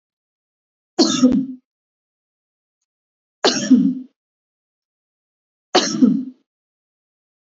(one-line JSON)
{"three_cough_length": "7.4 s", "three_cough_amplitude": 28070, "three_cough_signal_mean_std_ratio": 0.34, "survey_phase": "beta (2021-08-13 to 2022-03-07)", "age": "65+", "gender": "Female", "wearing_mask": "No", "symptom_change_to_sense_of_smell_or_taste": true, "symptom_loss_of_taste": true, "smoker_status": "Never smoked", "respiratory_condition_asthma": false, "respiratory_condition_other": true, "recruitment_source": "REACT", "submission_delay": "2 days", "covid_test_result": "Negative", "covid_test_method": "RT-qPCR", "influenza_a_test_result": "Negative", "influenza_b_test_result": "Negative"}